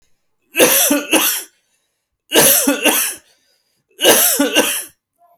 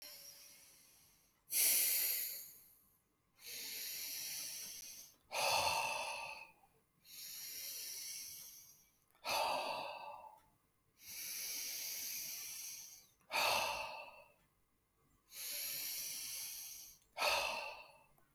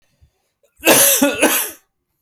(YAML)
three_cough_length: 5.4 s
three_cough_amplitude: 32768
three_cough_signal_mean_std_ratio: 0.55
exhalation_length: 18.3 s
exhalation_amplitude: 3019
exhalation_signal_mean_std_ratio: 0.6
cough_length: 2.2 s
cough_amplitude: 32767
cough_signal_mean_std_ratio: 0.49
survey_phase: beta (2021-08-13 to 2022-03-07)
age: 18-44
gender: Male
wearing_mask: 'No'
symptom_none: true
smoker_status: Never smoked
respiratory_condition_asthma: false
respiratory_condition_other: false
recruitment_source: REACT
submission_delay: 1 day
covid_test_result: Negative
covid_test_method: RT-qPCR